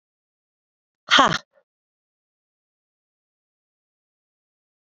{
  "exhalation_length": "4.9 s",
  "exhalation_amplitude": 27552,
  "exhalation_signal_mean_std_ratio": 0.16,
  "survey_phase": "beta (2021-08-13 to 2022-03-07)",
  "age": "45-64",
  "gender": "Female",
  "wearing_mask": "No",
  "symptom_cough_any": true,
  "symptom_runny_or_blocked_nose": true,
  "symptom_abdominal_pain": true,
  "symptom_diarrhoea": true,
  "symptom_fatigue": true,
  "symptom_change_to_sense_of_smell_or_taste": true,
  "symptom_loss_of_taste": true,
  "symptom_other": true,
  "symptom_onset": "5 days",
  "smoker_status": "Never smoked",
  "respiratory_condition_asthma": true,
  "respiratory_condition_other": false,
  "recruitment_source": "Test and Trace",
  "submission_delay": "2 days",
  "covid_test_result": "Positive",
  "covid_test_method": "RT-qPCR"
}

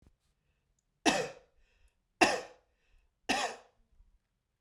{
  "three_cough_length": "4.6 s",
  "three_cough_amplitude": 11958,
  "three_cough_signal_mean_std_ratio": 0.28,
  "survey_phase": "beta (2021-08-13 to 2022-03-07)",
  "age": "18-44",
  "gender": "Male",
  "wearing_mask": "No",
  "symptom_none": true,
  "smoker_status": "Never smoked",
  "respiratory_condition_asthma": false,
  "respiratory_condition_other": false,
  "recruitment_source": "Test and Trace",
  "submission_delay": "0 days",
  "covid_test_result": "Negative",
  "covid_test_method": "LFT"
}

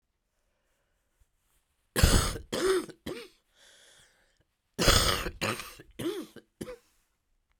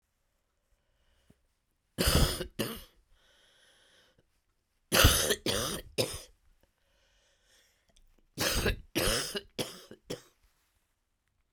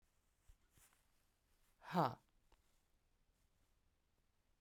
{
  "cough_length": "7.6 s",
  "cough_amplitude": 15929,
  "cough_signal_mean_std_ratio": 0.36,
  "three_cough_length": "11.5 s",
  "three_cough_amplitude": 15083,
  "three_cough_signal_mean_std_ratio": 0.35,
  "exhalation_length": "4.6 s",
  "exhalation_amplitude": 2062,
  "exhalation_signal_mean_std_ratio": 0.19,
  "survey_phase": "beta (2021-08-13 to 2022-03-07)",
  "age": "65+",
  "gender": "Female",
  "wearing_mask": "No",
  "symptom_cough_any": true,
  "symptom_runny_or_blocked_nose": true,
  "symptom_shortness_of_breath": true,
  "symptom_fatigue": true,
  "symptom_change_to_sense_of_smell_or_taste": true,
  "symptom_onset": "10 days",
  "smoker_status": "Never smoked",
  "respiratory_condition_asthma": false,
  "respiratory_condition_other": false,
  "recruitment_source": "Test and Trace",
  "submission_delay": "1 day",
  "covid_test_result": "Positive",
  "covid_test_method": "RT-qPCR",
  "covid_ct_value": 24.6,
  "covid_ct_gene": "ORF1ab gene",
  "covid_ct_mean": 25.0,
  "covid_viral_load": "6500 copies/ml",
  "covid_viral_load_category": "Minimal viral load (< 10K copies/ml)"
}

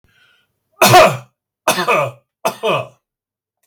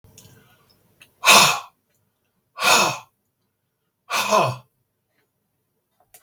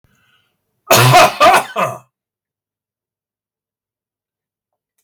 {
  "three_cough_length": "3.7 s",
  "three_cough_amplitude": 32768,
  "three_cough_signal_mean_std_ratio": 0.41,
  "exhalation_length": "6.2 s",
  "exhalation_amplitude": 32768,
  "exhalation_signal_mean_std_ratio": 0.32,
  "cough_length": "5.0 s",
  "cough_amplitude": 32768,
  "cough_signal_mean_std_ratio": 0.34,
  "survey_phase": "beta (2021-08-13 to 2022-03-07)",
  "age": "45-64",
  "gender": "Male",
  "wearing_mask": "No",
  "symptom_cough_any": true,
  "smoker_status": "Ex-smoker",
  "respiratory_condition_asthma": false,
  "respiratory_condition_other": false,
  "recruitment_source": "REACT",
  "submission_delay": "1 day",
  "covid_test_result": "Negative",
  "covid_test_method": "RT-qPCR"
}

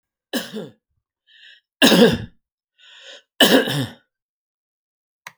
{
  "three_cough_length": "5.4 s",
  "three_cough_amplitude": 32767,
  "three_cough_signal_mean_std_ratio": 0.32,
  "survey_phase": "alpha (2021-03-01 to 2021-08-12)",
  "age": "65+",
  "gender": "Male",
  "wearing_mask": "No",
  "symptom_none": true,
  "smoker_status": "Never smoked",
  "respiratory_condition_asthma": true,
  "respiratory_condition_other": false,
  "recruitment_source": "Test and Trace",
  "submission_delay": "0 days",
  "covid_test_result": "Negative",
  "covid_test_method": "LFT"
}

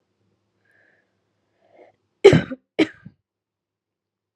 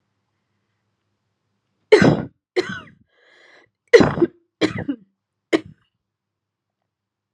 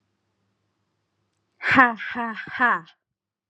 {
  "cough_length": "4.4 s",
  "cough_amplitude": 32768,
  "cough_signal_mean_std_ratio": 0.18,
  "three_cough_length": "7.3 s",
  "three_cough_amplitude": 32768,
  "three_cough_signal_mean_std_ratio": 0.25,
  "exhalation_length": "3.5 s",
  "exhalation_amplitude": 29768,
  "exhalation_signal_mean_std_ratio": 0.34,
  "survey_phase": "alpha (2021-03-01 to 2021-08-12)",
  "age": "18-44",
  "gender": "Female",
  "wearing_mask": "No",
  "symptom_cough_any": true,
  "symptom_change_to_sense_of_smell_or_taste": true,
  "smoker_status": "Current smoker (e-cigarettes or vapes only)",
  "respiratory_condition_asthma": false,
  "respiratory_condition_other": false,
  "recruitment_source": "Test and Trace",
  "submission_delay": "1 day",
  "covid_test_result": "Positive",
  "covid_test_method": "RT-qPCR"
}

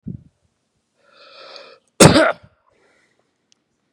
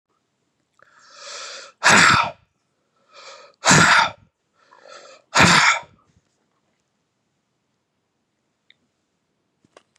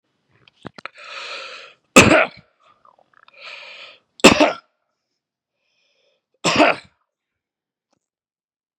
{
  "cough_length": "3.9 s",
  "cough_amplitude": 32768,
  "cough_signal_mean_std_ratio": 0.23,
  "exhalation_length": "10.0 s",
  "exhalation_amplitude": 32023,
  "exhalation_signal_mean_std_ratio": 0.31,
  "three_cough_length": "8.8 s",
  "three_cough_amplitude": 32768,
  "three_cough_signal_mean_std_ratio": 0.25,
  "survey_phase": "beta (2021-08-13 to 2022-03-07)",
  "age": "45-64",
  "gender": "Male",
  "wearing_mask": "No",
  "symptom_none": true,
  "smoker_status": "Ex-smoker",
  "respiratory_condition_asthma": false,
  "respiratory_condition_other": false,
  "recruitment_source": "REACT",
  "submission_delay": "4 days",
  "covid_test_result": "Negative",
  "covid_test_method": "RT-qPCR",
  "influenza_a_test_result": "Unknown/Void",
  "influenza_b_test_result": "Unknown/Void"
}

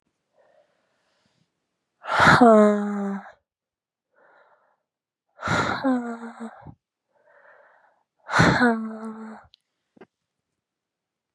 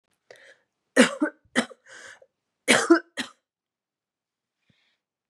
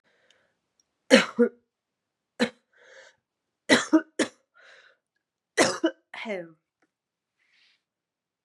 {
  "exhalation_length": "11.3 s",
  "exhalation_amplitude": 27544,
  "exhalation_signal_mean_std_ratio": 0.34,
  "cough_length": "5.3 s",
  "cough_amplitude": 26117,
  "cough_signal_mean_std_ratio": 0.26,
  "three_cough_length": "8.4 s",
  "three_cough_amplitude": 26206,
  "three_cough_signal_mean_std_ratio": 0.25,
  "survey_phase": "beta (2021-08-13 to 2022-03-07)",
  "age": "18-44",
  "gender": "Female",
  "wearing_mask": "No",
  "symptom_cough_any": true,
  "symptom_new_continuous_cough": true,
  "symptom_runny_or_blocked_nose": true,
  "symptom_sore_throat": true,
  "symptom_fatigue": true,
  "symptom_fever_high_temperature": true,
  "symptom_onset": "5 days",
  "smoker_status": "Ex-smoker",
  "respiratory_condition_asthma": false,
  "respiratory_condition_other": false,
  "recruitment_source": "Test and Trace",
  "submission_delay": "2 days",
  "covid_test_result": "Positive",
  "covid_test_method": "RT-qPCR",
  "covid_ct_value": 19.1,
  "covid_ct_gene": "ORF1ab gene",
  "covid_ct_mean": 19.3,
  "covid_viral_load": "450000 copies/ml",
  "covid_viral_load_category": "Low viral load (10K-1M copies/ml)"
}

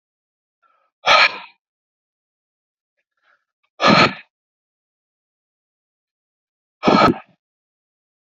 {
  "exhalation_length": "8.3 s",
  "exhalation_amplitude": 29758,
  "exhalation_signal_mean_std_ratio": 0.26,
  "survey_phase": "beta (2021-08-13 to 2022-03-07)",
  "age": "45-64",
  "gender": "Male",
  "wearing_mask": "No",
  "symptom_none": true,
  "smoker_status": "Ex-smoker",
  "respiratory_condition_asthma": false,
  "respiratory_condition_other": false,
  "recruitment_source": "REACT",
  "submission_delay": "10 days",
  "covid_test_result": "Negative",
  "covid_test_method": "RT-qPCR"
}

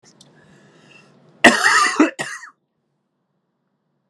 {
  "cough_length": "4.1 s",
  "cough_amplitude": 32768,
  "cough_signal_mean_std_ratio": 0.32,
  "survey_phase": "alpha (2021-03-01 to 2021-08-12)",
  "age": "18-44",
  "gender": "Male",
  "wearing_mask": "No",
  "symptom_cough_any": true,
  "symptom_diarrhoea": true,
  "symptom_fatigue": true,
  "symptom_fever_high_temperature": true,
  "symptom_headache": true,
  "symptom_change_to_sense_of_smell_or_taste": true,
  "symptom_loss_of_taste": true,
  "symptom_onset": "3 days",
  "smoker_status": "Never smoked",
  "respiratory_condition_asthma": false,
  "respiratory_condition_other": false,
  "recruitment_source": "Test and Trace",
  "submission_delay": "3 days",
  "covid_test_result": "Positive",
  "covid_test_method": "RT-qPCR",
  "covid_ct_value": 18.0,
  "covid_ct_gene": "ORF1ab gene",
  "covid_ct_mean": 19.2,
  "covid_viral_load": "490000 copies/ml",
  "covid_viral_load_category": "Low viral load (10K-1M copies/ml)"
}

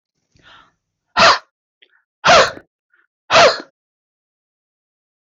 {
  "exhalation_length": "5.3 s",
  "exhalation_amplitude": 26277,
  "exhalation_signal_mean_std_ratio": 0.32,
  "survey_phase": "beta (2021-08-13 to 2022-03-07)",
  "age": "65+",
  "gender": "Female",
  "wearing_mask": "No",
  "symptom_none": true,
  "smoker_status": "Ex-smoker",
  "respiratory_condition_asthma": false,
  "respiratory_condition_other": false,
  "recruitment_source": "REACT",
  "submission_delay": "2 days",
  "covid_test_result": "Negative",
  "covid_test_method": "RT-qPCR",
  "influenza_a_test_result": "Negative",
  "influenza_b_test_result": "Negative"
}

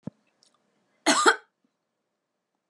{
  "cough_length": "2.7 s",
  "cough_amplitude": 17451,
  "cough_signal_mean_std_ratio": 0.25,
  "survey_phase": "beta (2021-08-13 to 2022-03-07)",
  "age": "18-44",
  "gender": "Female",
  "wearing_mask": "No",
  "symptom_none": true,
  "smoker_status": "Never smoked",
  "respiratory_condition_asthma": false,
  "respiratory_condition_other": false,
  "recruitment_source": "REACT",
  "submission_delay": "1 day",
  "covid_test_result": "Negative",
  "covid_test_method": "RT-qPCR",
  "influenza_a_test_result": "Negative",
  "influenza_b_test_result": "Negative"
}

